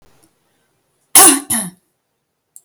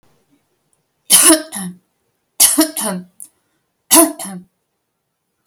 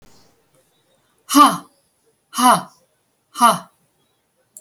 {"cough_length": "2.6 s", "cough_amplitude": 32768, "cough_signal_mean_std_ratio": 0.29, "three_cough_length": "5.5 s", "three_cough_amplitude": 32768, "three_cough_signal_mean_std_ratio": 0.34, "exhalation_length": "4.6 s", "exhalation_amplitude": 31379, "exhalation_signal_mean_std_ratio": 0.3, "survey_phase": "alpha (2021-03-01 to 2021-08-12)", "age": "65+", "gender": "Female", "wearing_mask": "No", "symptom_none": true, "smoker_status": "Never smoked", "respiratory_condition_asthma": false, "respiratory_condition_other": false, "recruitment_source": "REACT", "submission_delay": "2 days", "covid_test_result": "Negative", "covid_test_method": "RT-qPCR"}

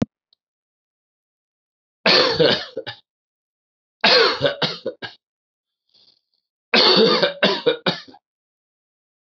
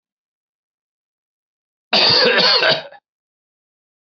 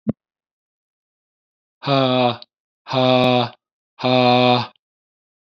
{"three_cough_length": "9.3 s", "three_cough_amplitude": 25896, "three_cough_signal_mean_std_ratio": 0.39, "cough_length": "4.2 s", "cough_amplitude": 26737, "cough_signal_mean_std_ratio": 0.39, "exhalation_length": "5.5 s", "exhalation_amplitude": 25747, "exhalation_signal_mean_std_ratio": 0.43, "survey_phase": "beta (2021-08-13 to 2022-03-07)", "age": "45-64", "gender": "Male", "wearing_mask": "No", "symptom_cough_any": true, "symptom_new_continuous_cough": true, "symptom_runny_or_blocked_nose": true, "symptom_sore_throat": true, "symptom_change_to_sense_of_smell_or_taste": true, "symptom_loss_of_taste": true, "symptom_other": true, "symptom_onset": "4 days", "smoker_status": "Never smoked", "respiratory_condition_asthma": false, "respiratory_condition_other": false, "recruitment_source": "Test and Trace", "submission_delay": "2 days", "covid_test_result": "Positive", "covid_test_method": "RT-qPCR", "covid_ct_value": 15.2, "covid_ct_gene": "ORF1ab gene", "covid_ct_mean": 15.9, "covid_viral_load": "6300000 copies/ml", "covid_viral_load_category": "High viral load (>1M copies/ml)"}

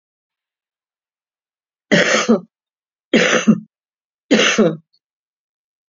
{"three_cough_length": "5.9 s", "three_cough_amplitude": 31586, "three_cough_signal_mean_std_ratio": 0.37, "survey_phase": "beta (2021-08-13 to 2022-03-07)", "age": "45-64", "gender": "Female", "wearing_mask": "No", "symptom_cough_any": true, "symptom_runny_or_blocked_nose": true, "symptom_sore_throat": true, "symptom_abdominal_pain": true, "symptom_onset": "4 days", "smoker_status": "Current smoker (1 to 10 cigarettes per day)", "respiratory_condition_asthma": true, "respiratory_condition_other": false, "recruitment_source": "Test and Trace", "submission_delay": "2 days", "covid_test_result": "Positive", "covid_test_method": "RT-qPCR", "covid_ct_value": 28.5, "covid_ct_gene": "N gene"}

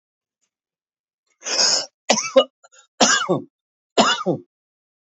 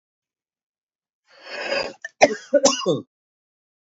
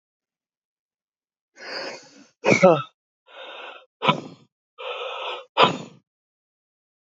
{"three_cough_length": "5.1 s", "three_cough_amplitude": 29317, "three_cough_signal_mean_std_ratio": 0.39, "cough_length": "3.9 s", "cough_amplitude": 27907, "cough_signal_mean_std_ratio": 0.32, "exhalation_length": "7.2 s", "exhalation_amplitude": 27443, "exhalation_signal_mean_std_ratio": 0.29, "survey_phase": "beta (2021-08-13 to 2022-03-07)", "age": "65+", "gender": "Male", "wearing_mask": "No", "symptom_none": true, "smoker_status": "Never smoked", "respiratory_condition_asthma": false, "respiratory_condition_other": false, "recruitment_source": "REACT", "submission_delay": "1 day", "covid_test_result": "Negative", "covid_test_method": "RT-qPCR", "influenza_a_test_result": "Negative", "influenza_b_test_result": "Negative"}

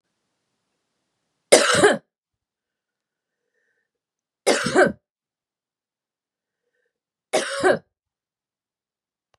{"three_cough_length": "9.4 s", "three_cough_amplitude": 32768, "three_cough_signal_mean_std_ratio": 0.26, "survey_phase": "beta (2021-08-13 to 2022-03-07)", "age": "45-64", "gender": "Female", "wearing_mask": "No", "symptom_cough_any": true, "symptom_runny_or_blocked_nose": true, "smoker_status": "Ex-smoker", "respiratory_condition_asthma": false, "respiratory_condition_other": false, "recruitment_source": "Test and Trace", "submission_delay": "1 day", "covid_test_result": "Positive", "covid_test_method": "RT-qPCR"}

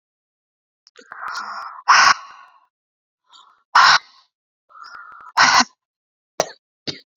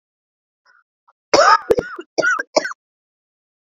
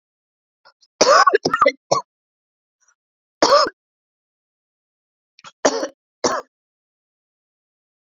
{"exhalation_length": "7.2 s", "exhalation_amplitude": 32768, "exhalation_signal_mean_std_ratio": 0.31, "cough_length": "3.7 s", "cough_amplitude": 30988, "cough_signal_mean_std_ratio": 0.34, "three_cough_length": "8.1 s", "three_cough_amplitude": 31144, "three_cough_signal_mean_std_ratio": 0.29, "survey_phase": "beta (2021-08-13 to 2022-03-07)", "age": "18-44", "gender": "Female", "wearing_mask": "No", "symptom_cough_any": true, "symptom_runny_or_blocked_nose": true, "symptom_sore_throat": true, "symptom_fatigue": true, "smoker_status": "Never smoked", "respiratory_condition_asthma": false, "respiratory_condition_other": false, "recruitment_source": "Test and Trace", "submission_delay": "1 day", "covid_test_result": "Positive", "covid_test_method": "RT-qPCR", "covid_ct_value": 28.2, "covid_ct_gene": "ORF1ab gene", "covid_ct_mean": 29.1, "covid_viral_load": "290 copies/ml", "covid_viral_load_category": "Minimal viral load (< 10K copies/ml)"}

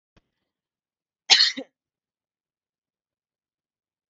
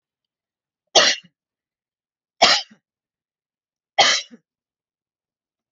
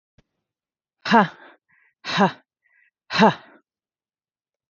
{"cough_length": "4.1 s", "cough_amplitude": 29560, "cough_signal_mean_std_ratio": 0.17, "three_cough_length": "5.7 s", "three_cough_amplitude": 31598, "three_cough_signal_mean_std_ratio": 0.25, "exhalation_length": "4.7 s", "exhalation_amplitude": 27522, "exhalation_signal_mean_std_ratio": 0.27, "survey_phase": "alpha (2021-03-01 to 2021-08-12)", "age": "18-44", "gender": "Female", "wearing_mask": "No", "symptom_none": true, "smoker_status": "Never smoked", "respiratory_condition_asthma": false, "respiratory_condition_other": false, "recruitment_source": "REACT", "submission_delay": "1 day", "covid_test_result": "Negative", "covid_test_method": "RT-qPCR"}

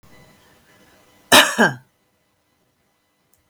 {"cough_length": "3.5 s", "cough_amplitude": 32557, "cough_signal_mean_std_ratio": 0.24, "survey_phase": "beta (2021-08-13 to 2022-03-07)", "age": "45-64", "gender": "Female", "wearing_mask": "No", "symptom_none": true, "smoker_status": "Current smoker (e-cigarettes or vapes only)", "respiratory_condition_asthma": false, "respiratory_condition_other": false, "recruitment_source": "REACT", "submission_delay": "2 days", "covid_test_result": "Negative", "covid_test_method": "RT-qPCR", "influenza_a_test_result": "Negative", "influenza_b_test_result": "Negative"}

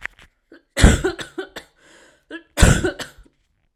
{"cough_length": "3.8 s", "cough_amplitude": 32768, "cough_signal_mean_std_ratio": 0.32, "survey_phase": "alpha (2021-03-01 to 2021-08-12)", "age": "18-44", "gender": "Female", "wearing_mask": "No", "symptom_cough_any": true, "smoker_status": "Never smoked", "respiratory_condition_asthma": false, "respiratory_condition_other": false, "recruitment_source": "REACT", "submission_delay": "6 days", "covid_test_result": "Negative", "covid_test_method": "RT-qPCR"}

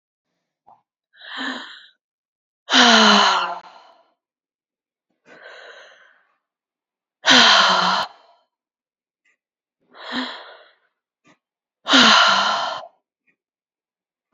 {"exhalation_length": "14.3 s", "exhalation_amplitude": 32768, "exhalation_signal_mean_std_ratio": 0.35, "survey_phase": "beta (2021-08-13 to 2022-03-07)", "age": "18-44", "gender": "Female", "wearing_mask": "No", "symptom_cough_any": true, "symptom_runny_or_blocked_nose": true, "symptom_diarrhoea": true, "symptom_fatigue": true, "symptom_headache": true, "symptom_change_to_sense_of_smell_or_taste": true, "symptom_loss_of_taste": true, "symptom_onset": "4 days", "smoker_status": "Never smoked", "respiratory_condition_asthma": false, "respiratory_condition_other": false, "recruitment_source": "Test and Trace", "submission_delay": "2 days", "covid_test_result": "Positive", "covid_test_method": "RT-qPCR"}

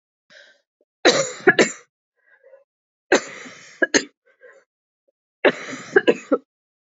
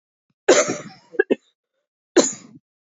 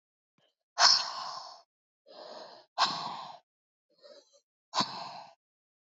{"three_cough_length": "6.8 s", "three_cough_amplitude": 29531, "three_cough_signal_mean_std_ratio": 0.29, "cough_length": "2.8 s", "cough_amplitude": 28924, "cough_signal_mean_std_ratio": 0.31, "exhalation_length": "5.8 s", "exhalation_amplitude": 16096, "exhalation_signal_mean_std_ratio": 0.32, "survey_phase": "alpha (2021-03-01 to 2021-08-12)", "age": "18-44", "gender": "Female", "wearing_mask": "No", "symptom_cough_any": true, "symptom_new_continuous_cough": true, "symptom_fatigue": true, "symptom_fever_high_temperature": true, "symptom_headache": true, "symptom_loss_of_taste": true, "symptom_onset": "3 days", "smoker_status": "Never smoked", "respiratory_condition_asthma": false, "respiratory_condition_other": false, "recruitment_source": "Test and Trace", "submission_delay": "2 days", "covid_test_result": "Positive", "covid_test_method": "RT-qPCR", "covid_ct_value": 19.0, "covid_ct_gene": "ORF1ab gene", "covid_ct_mean": 19.2, "covid_viral_load": "520000 copies/ml", "covid_viral_load_category": "Low viral load (10K-1M copies/ml)"}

